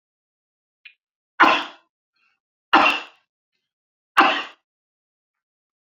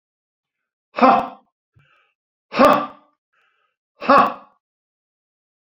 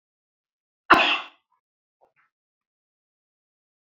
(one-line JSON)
{"three_cough_length": "5.8 s", "three_cough_amplitude": 28549, "three_cough_signal_mean_std_ratio": 0.27, "exhalation_length": "5.7 s", "exhalation_amplitude": 32487, "exhalation_signal_mean_std_ratio": 0.29, "cough_length": "3.8 s", "cough_amplitude": 27718, "cough_signal_mean_std_ratio": 0.2, "survey_phase": "beta (2021-08-13 to 2022-03-07)", "age": "65+", "gender": "Male", "wearing_mask": "No", "symptom_none": true, "smoker_status": "Never smoked", "respiratory_condition_asthma": false, "respiratory_condition_other": false, "recruitment_source": "REACT", "submission_delay": "1 day", "covid_test_result": "Negative", "covid_test_method": "RT-qPCR"}